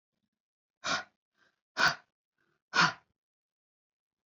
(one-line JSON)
{"exhalation_length": "4.3 s", "exhalation_amplitude": 8042, "exhalation_signal_mean_std_ratio": 0.25, "survey_phase": "alpha (2021-03-01 to 2021-08-12)", "age": "65+", "gender": "Female", "wearing_mask": "No", "symptom_none": true, "smoker_status": "Ex-smoker", "respiratory_condition_asthma": false, "respiratory_condition_other": false, "recruitment_source": "REACT", "submission_delay": "1 day", "covid_test_result": "Negative", "covid_test_method": "RT-qPCR"}